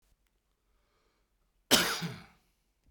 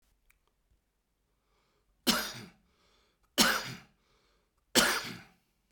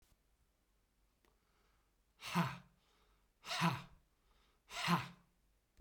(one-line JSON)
{"cough_length": "2.9 s", "cough_amplitude": 11913, "cough_signal_mean_std_ratio": 0.26, "three_cough_length": "5.7 s", "three_cough_amplitude": 13077, "three_cough_signal_mean_std_ratio": 0.29, "exhalation_length": "5.8 s", "exhalation_amplitude": 2459, "exhalation_signal_mean_std_ratio": 0.32, "survey_phase": "beta (2021-08-13 to 2022-03-07)", "age": "45-64", "gender": "Male", "wearing_mask": "No", "symptom_runny_or_blocked_nose": true, "symptom_shortness_of_breath": true, "symptom_headache": true, "symptom_change_to_sense_of_smell_or_taste": true, "smoker_status": "Ex-smoker", "respiratory_condition_asthma": false, "respiratory_condition_other": true, "recruitment_source": "REACT", "submission_delay": "-1 day", "covid_test_result": "Negative", "covid_test_method": "RT-qPCR"}